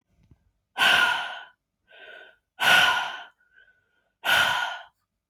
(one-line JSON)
{"exhalation_length": "5.3 s", "exhalation_amplitude": 18451, "exhalation_signal_mean_std_ratio": 0.45, "survey_phase": "beta (2021-08-13 to 2022-03-07)", "age": "18-44", "gender": "Female", "wearing_mask": "No", "symptom_none": true, "smoker_status": "Never smoked", "respiratory_condition_asthma": false, "respiratory_condition_other": false, "recruitment_source": "REACT", "submission_delay": "1 day", "covid_test_result": "Negative", "covid_test_method": "RT-qPCR", "influenza_a_test_result": "Unknown/Void", "influenza_b_test_result": "Unknown/Void"}